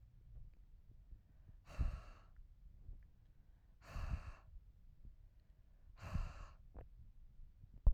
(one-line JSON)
{"exhalation_length": "7.9 s", "exhalation_amplitude": 3298, "exhalation_signal_mean_std_ratio": 0.34, "survey_phase": "alpha (2021-03-01 to 2021-08-12)", "age": "45-64", "gender": "Female", "wearing_mask": "No", "symptom_none": true, "smoker_status": "Never smoked", "respiratory_condition_asthma": false, "respiratory_condition_other": false, "recruitment_source": "REACT", "submission_delay": "2 days", "covid_test_result": "Negative", "covid_test_method": "RT-qPCR"}